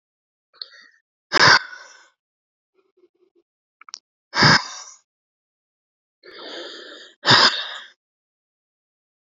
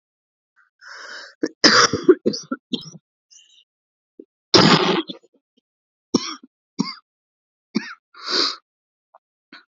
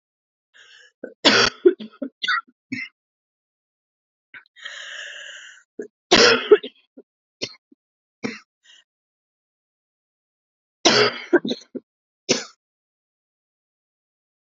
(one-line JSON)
{"exhalation_length": "9.3 s", "exhalation_amplitude": 32281, "exhalation_signal_mean_std_ratio": 0.26, "cough_length": "9.7 s", "cough_amplitude": 31842, "cough_signal_mean_std_ratio": 0.31, "three_cough_length": "14.5 s", "three_cough_amplitude": 30374, "three_cough_signal_mean_std_ratio": 0.27, "survey_phase": "alpha (2021-03-01 to 2021-08-12)", "age": "18-44", "gender": "Female", "wearing_mask": "No", "symptom_cough_any": true, "symptom_shortness_of_breath": true, "symptom_fatigue": true, "symptom_fever_high_temperature": true, "symptom_headache": true, "symptom_loss_of_taste": true, "symptom_onset": "2 days", "smoker_status": "Never smoked", "respiratory_condition_asthma": false, "respiratory_condition_other": false, "recruitment_source": "Test and Trace", "submission_delay": "1 day", "covid_test_result": "Positive", "covid_test_method": "RT-qPCR", "covid_ct_value": 18.2, "covid_ct_gene": "ORF1ab gene", "covid_ct_mean": 18.8, "covid_viral_load": "660000 copies/ml", "covid_viral_load_category": "Low viral load (10K-1M copies/ml)"}